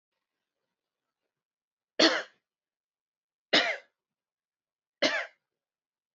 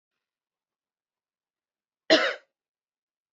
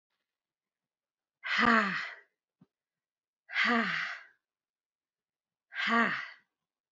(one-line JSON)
{"three_cough_length": "6.1 s", "three_cough_amplitude": 13779, "three_cough_signal_mean_std_ratio": 0.23, "cough_length": "3.3 s", "cough_amplitude": 23166, "cough_signal_mean_std_ratio": 0.19, "exhalation_length": "6.9 s", "exhalation_amplitude": 8684, "exhalation_signal_mean_std_ratio": 0.38, "survey_phase": "beta (2021-08-13 to 2022-03-07)", "age": "18-44", "gender": "Female", "wearing_mask": "No", "symptom_sore_throat": true, "symptom_onset": "4 days", "smoker_status": "Never smoked", "respiratory_condition_asthma": false, "respiratory_condition_other": false, "recruitment_source": "Test and Trace", "submission_delay": "1 day", "covid_test_result": "Positive", "covid_test_method": "RT-qPCR"}